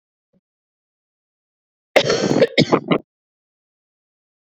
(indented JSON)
{
  "cough_length": "4.4 s",
  "cough_amplitude": 32768,
  "cough_signal_mean_std_ratio": 0.31,
  "survey_phase": "beta (2021-08-13 to 2022-03-07)",
  "age": "18-44",
  "gender": "Female",
  "wearing_mask": "No",
  "symptom_cough_any": true,
  "symptom_runny_or_blocked_nose": true,
  "symptom_shortness_of_breath": true,
  "symptom_sore_throat": true,
  "symptom_abdominal_pain": true,
  "symptom_fatigue": true,
  "symptom_fever_high_temperature": true,
  "symptom_headache": true,
  "symptom_change_to_sense_of_smell_or_taste": true,
  "symptom_loss_of_taste": true,
  "symptom_onset": "6 days",
  "smoker_status": "Never smoked",
  "respiratory_condition_asthma": false,
  "respiratory_condition_other": false,
  "recruitment_source": "Test and Trace",
  "submission_delay": "1 day",
  "covid_test_result": "Positive",
  "covid_test_method": "RT-qPCR",
  "covid_ct_value": 19.9,
  "covid_ct_gene": "ORF1ab gene",
  "covid_ct_mean": 20.2,
  "covid_viral_load": "240000 copies/ml",
  "covid_viral_load_category": "Low viral load (10K-1M copies/ml)"
}